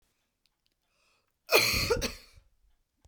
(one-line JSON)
{"cough_length": "3.1 s", "cough_amplitude": 12231, "cough_signal_mean_std_ratio": 0.34, "survey_phase": "beta (2021-08-13 to 2022-03-07)", "age": "45-64", "gender": "Female", "wearing_mask": "No", "symptom_none": true, "smoker_status": "Never smoked", "respiratory_condition_asthma": false, "respiratory_condition_other": false, "recruitment_source": "Test and Trace", "submission_delay": "2 days", "covid_test_result": "Negative", "covid_test_method": "RT-qPCR"}